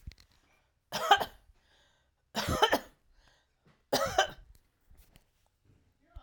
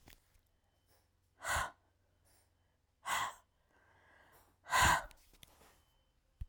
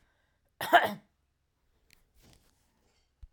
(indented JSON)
{
  "three_cough_length": "6.2 s",
  "three_cough_amplitude": 16216,
  "three_cough_signal_mean_std_ratio": 0.3,
  "exhalation_length": "6.5 s",
  "exhalation_amplitude": 4331,
  "exhalation_signal_mean_std_ratio": 0.29,
  "cough_length": "3.3 s",
  "cough_amplitude": 13688,
  "cough_signal_mean_std_ratio": 0.19,
  "survey_phase": "alpha (2021-03-01 to 2021-08-12)",
  "age": "45-64",
  "gender": "Female",
  "wearing_mask": "No",
  "symptom_none": true,
  "smoker_status": "Ex-smoker",
  "respiratory_condition_asthma": false,
  "respiratory_condition_other": false,
  "recruitment_source": "REACT",
  "submission_delay": "2 days",
  "covid_test_result": "Negative",
  "covid_test_method": "RT-qPCR"
}